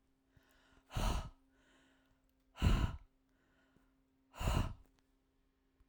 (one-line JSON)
{"exhalation_length": "5.9 s", "exhalation_amplitude": 3773, "exhalation_signal_mean_std_ratio": 0.34, "survey_phase": "alpha (2021-03-01 to 2021-08-12)", "age": "45-64", "gender": "Female", "wearing_mask": "No", "symptom_none": true, "smoker_status": "Never smoked", "respiratory_condition_asthma": false, "respiratory_condition_other": false, "recruitment_source": "REACT", "submission_delay": "3 days", "covid_test_result": "Negative", "covid_test_method": "RT-qPCR"}